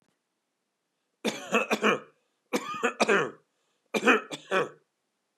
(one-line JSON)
{"three_cough_length": "5.4 s", "three_cough_amplitude": 15654, "three_cough_signal_mean_std_ratio": 0.41, "survey_phase": "beta (2021-08-13 to 2022-03-07)", "age": "45-64", "gender": "Male", "wearing_mask": "No", "symptom_none": true, "smoker_status": "Never smoked", "respiratory_condition_asthma": false, "respiratory_condition_other": false, "recruitment_source": "REACT", "submission_delay": "1 day", "covid_test_result": "Negative", "covid_test_method": "RT-qPCR", "influenza_a_test_result": "Negative", "influenza_b_test_result": "Negative"}